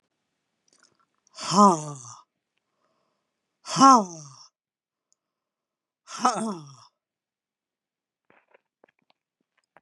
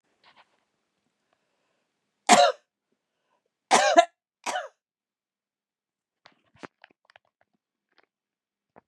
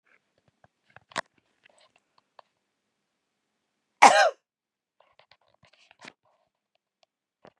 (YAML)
exhalation_length: 9.8 s
exhalation_amplitude: 26682
exhalation_signal_mean_std_ratio: 0.22
three_cough_length: 8.9 s
three_cough_amplitude: 28010
three_cough_signal_mean_std_ratio: 0.2
cough_length: 7.6 s
cough_amplitude: 32681
cough_signal_mean_std_ratio: 0.15
survey_phase: beta (2021-08-13 to 2022-03-07)
age: 45-64
gender: Female
wearing_mask: 'No'
symptom_none: true
smoker_status: Ex-smoker
respiratory_condition_asthma: false
respiratory_condition_other: false
recruitment_source: REACT
submission_delay: 2 days
covid_test_result: Negative
covid_test_method: RT-qPCR
influenza_a_test_result: Negative
influenza_b_test_result: Negative